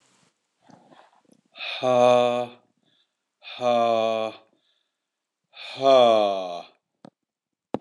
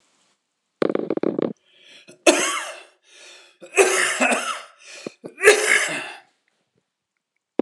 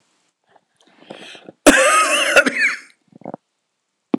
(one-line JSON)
{"exhalation_length": "7.8 s", "exhalation_amplitude": 16081, "exhalation_signal_mean_std_ratio": 0.41, "three_cough_length": "7.6 s", "three_cough_amplitude": 26028, "three_cough_signal_mean_std_ratio": 0.4, "cough_length": "4.2 s", "cough_amplitude": 26028, "cough_signal_mean_std_ratio": 0.41, "survey_phase": "beta (2021-08-13 to 2022-03-07)", "age": "65+", "gender": "Male", "wearing_mask": "No", "symptom_cough_any": true, "symptom_runny_or_blocked_nose": true, "symptom_sore_throat": true, "symptom_abdominal_pain": true, "symptom_fatigue": true, "symptom_change_to_sense_of_smell_or_taste": true, "symptom_onset": "2 days", "smoker_status": "Never smoked", "respiratory_condition_asthma": false, "respiratory_condition_other": false, "recruitment_source": "Test and Trace", "submission_delay": "1 day", "covid_test_result": "Positive", "covid_test_method": "RT-qPCR", "covid_ct_value": 18.9, "covid_ct_gene": "N gene"}